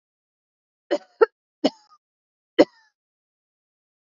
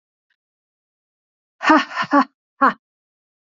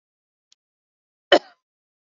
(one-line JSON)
{"three_cough_length": "4.0 s", "three_cough_amplitude": 26995, "three_cough_signal_mean_std_ratio": 0.16, "exhalation_length": "3.5 s", "exhalation_amplitude": 27847, "exhalation_signal_mean_std_ratio": 0.29, "cough_length": "2.0 s", "cough_amplitude": 31019, "cough_signal_mean_std_ratio": 0.13, "survey_phase": "beta (2021-08-13 to 2022-03-07)", "age": "45-64", "gender": "Female", "wearing_mask": "No", "symptom_runny_or_blocked_nose": true, "symptom_sore_throat": true, "symptom_fatigue": true, "symptom_headache": true, "symptom_onset": "3 days", "smoker_status": "Never smoked", "respiratory_condition_asthma": false, "respiratory_condition_other": false, "recruitment_source": "Test and Trace", "submission_delay": "2 days", "covid_test_result": "Positive", "covid_test_method": "RT-qPCR", "covid_ct_value": 19.1, "covid_ct_gene": "ORF1ab gene", "covid_ct_mean": 19.4, "covid_viral_load": "450000 copies/ml", "covid_viral_load_category": "Low viral load (10K-1M copies/ml)"}